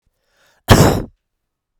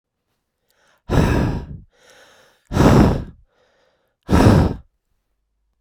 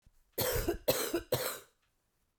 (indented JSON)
{
  "cough_length": "1.8 s",
  "cough_amplitude": 32768,
  "cough_signal_mean_std_ratio": 0.32,
  "exhalation_length": "5.8 s",
  "exhalation_amplitude": 32767,
  "exhalation_signal_mean_std_ratio": 0.4,
  "three_cough_length": "2.4 s",
  "three_cough_amplitude": 5355,
  "three_cough_signal_mean_std_ratio": 0.53,
  "survey_phase": "beta (2021-08-13 to 2022-03-07)",
  "age": "45-64",
  "gender": "Female",
  "wearing_mask": "No",
  "symptom_runny_or_blocked_nose": true,
  "symptom_shortness_of_breath": true,
  "symptom_fatigue": true,
  "symptom_headache": true,
  "symptom_change_to_sense_of_smell_or_taste": true,
  "symptom_loss_of_taste": true,
  "symptom_onset": "4 days",
  "smoker_status": "Never smoked",
  "respiratory_condition_asthma": true,
  "respiratory_condition_other": false,
  "recruitment_source": "Test and Trace",
  "submission_delay": "2 days",
  "covid_test_result": "Positive",
  "covid_test_method": "RT-qPCR"
}